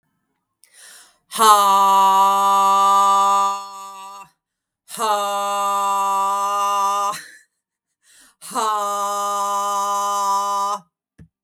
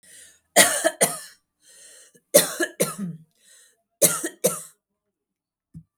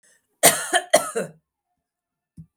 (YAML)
exhalation_length: 11.4 s
exhalation_amplitude: 32768
exhalation_signal_mean_std_ratio: 0.74
three_cough_length: 6.0 s
three_cough_amplitude: 32571
three_cough_signal_mean_std_ratio: 0.33
cough_length: 2.6 s
cough_amplitude: 32767
cough_signal_mean_std_ratio: 0.31
survey_phase: beta (2021-08-13 to 2022-03-07)
age: 45-64
gender: Female
wearing_mask: 'No'
symptom_runny_or_blocked_nose: true
symptom_sore_throat: true
smoker_status: Never smoked
respiratory_condition_asthma: false
respiratory_condition_other: false
recruitment_source: Test and Trace
submission_delay: 2 days
covid_test_result: Positive
covid_test_method: RT-qPCR
covid_ct_value: 35.0
covid_ct_gene: ORF1ab gene